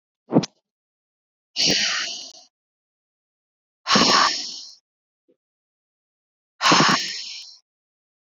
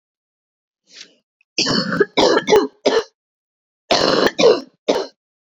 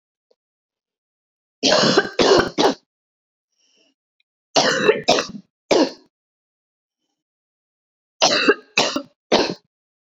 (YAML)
exhalation_length: 8.3 s
exhalation_amplitude: 23045
exhalation_signal_mean_std_ratio: 0.37
cough_length: 5.5 s
cough_amplitude: 27999
cough_signal_mean_std_ratio: 0.47
three_cough_length: 10.1 s
three_cough_amplitude: 27870
three_cough_signal_mean_std_ratio: 0.39
survey_phase: beta (2021-08-13 to 2022-03-07)
age: 18-44
gender: Female
wearing_mask: 'No'
symptom_cough_any: true
symptom_runny_or_blocked_nose: true
symptom_fatigue: true
smoker_status: Never smoked
respiratory_condition_asthma: false
respiratory_condition_other: false
recruitment_source: Test and Trace
submission_delay: 1 day
covid_test_result: Positive
covid_test_method: RT-qPCR
covid_ct_value: 23.4
covid_ct_gene: ORF1ab gene
covid_ct_mean: 24.0
covid_viral_load: 13000 copies/ml
covid_viral_load_category: Low viral load (10K-1M copies/ml)